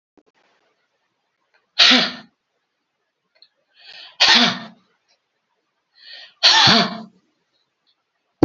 {"exhalation_length": "8.4 s", "exhalation_amplitude": 32433, "exhalation_signal_mean_std_ratio": 0.31, "survey_phase": "beta (2021-08-13 to 2022-03-07)", "age": "65+", "gender": "Female", "wearing_mask": "No", "symptom_none": true, "smoker_status": "Ex-smoker", "respiratory_condition_asthma": false, "respiratory_condition_other": false, "recruitment_source": "REACT", "submission_delay": "1 day", "covid_test_result": "Negative", "covid_test_method": "RT-qPCR", "influenza_a_test_result": "Negative", "influenza_b_test_result": "Negative"}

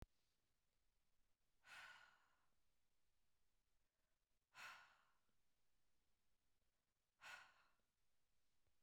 {"exhalation_length": "8.8 s", "exhalation_amplitude": 187, "exhalation_signal_mean_std_ratio": 0.47, "survey_phase": "beta (2021-08-13 to 2022-03-07)", "age": "45-64", "gender": "Female", "wearing_mask": "No", "symptom_none": true, "smoker_status": "Never smoked", "respiratory_condition_asthma": false, "respiratory_condition_other": false, "recruitment_source": "REACT", "submission_delay": "1 day", "covid_test_result": "Negative", "covid_test_method": "RT-qPCR", "influenza_a_test_result": "Negative", "influenza_b_test_result": "Negative"}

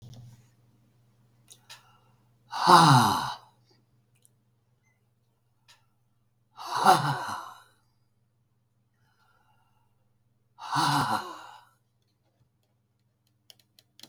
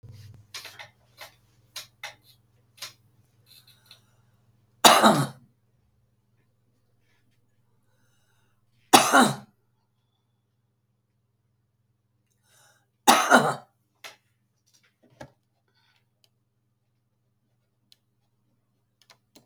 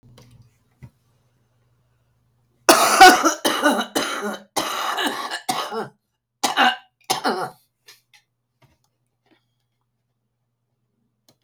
{"exhalation_length": "14.1 s", "exhalation_amplitude": 22952, "exhalation_signal_mean_std_ratio": 0.27, "three_cough_length": "19.5 s", "three_cough_amplitude": 32768, "three_cough_signal_mean_std_ratio": 0.2, "cough_length": "11.4 s", "cough_amplitude": 32768, "cough_signal_mean_std_ratio": 0.33, "survey_phase": "beta (2021-08-13 to 2022-03-07)", "age": "65+", "gender": "Female", "wearing_mask": "No", "symptom_cough_any": true, "symptom_runny_or_blocked_nose": true, "symptom_diarrhoea": true, "smoker_status": "Ex-smoker", "respiratory_condition_asthma": false, "respiratory_condition_other": true, "recruitment_source": "REACT", "submission_delay": "1 day", "covid_test_result": "Negative", "covid_test_method": "RT-qPCR", "influenza_a_test_result": "Negative", "influenza_b_test_result": "Negative"}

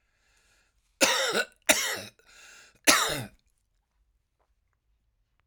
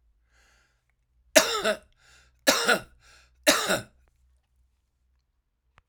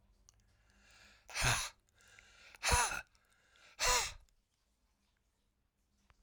{"cough_length": "5.5 s", "cough_amplitude": 25096, "cough_signal_mean_std_ratio": 0.33, "three_cough_length": "5.9 s", "three_cough_amplitude": 28638, "three_cough_signal_mean_std_ratio": 0.3, "exhalation_length": "6.2 s", "exhalation_amplitude": 4243, "exhalation_signal_mean_std_ratio": 0.33, "survey_phase": "alpha (2021-03-01 to 2021-08-12)", "age": "65+", "gender": "Male", "wearing_mask": "No", "symptom_cough_any": true, "symptom_fatigue": true, "symptom_onset": "3 days", "smoker_status": "Ex-smoker", "respiratory_condition_asthma": false, "respiratory_condition_other": false, "recruitment_source": "Test and Trace", "submission_delay": "2 days", "covid_test_result": "Positive", "covid_test_method": "RT-qPCR", "covid_ct_value": 18.9, "covid_ct_gene": "ORF1ab gene"}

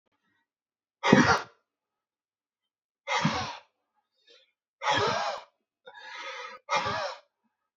{"exhalation_length": "7.8 s", "exhalation_amplitude": 25744, "exhalation_signal_mean_std_ratio": 0.36, "survey_phase": "beta (2021-08-13 to 2022-03-07)", "age": "18-44", "gender": "Male", "wearing_mask": "No", "symptom_none": true, "smoker_status": "Ex-smoker", "respiratory_condition_asthma": false, "respiratory_condition_other": false, "recruitment_source": "REACT", "submission_delay": "11 days", "covid_test_result": "Negative", "covid_test_method": "RT-qPCR"}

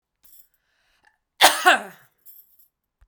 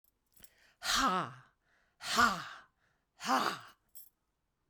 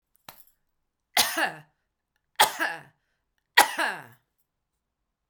{"cough_length": "3.1 s", "cough_amplitude": 32767, "cough_signal_mean_std_ratio": 0.24, "exhalation_length": "4.7 s", "exhalation_amplitude": 7100, "exhalation_signal_mean_std_ratio": 0.4, "three_cough_length": "5.3 s", "three_cough_amplitude": 32767, "three_cough_signal_mean_std_ratio": 0.28, "survey_phase": "beta (2021-08-13 to 2022-03-07)", "age": "65+", "gender": "Female", "wearing_mask": "No", "symptom_none": true, "smoker_status": "Never smoked", "respiratory_condition_asthma": false, "respiratory_condition_other": false, "recruitment_source": "REACT", "submission_delay": "4 days", "covid_test_result": "Negative", "covid_test_method": "RT-qPCR"}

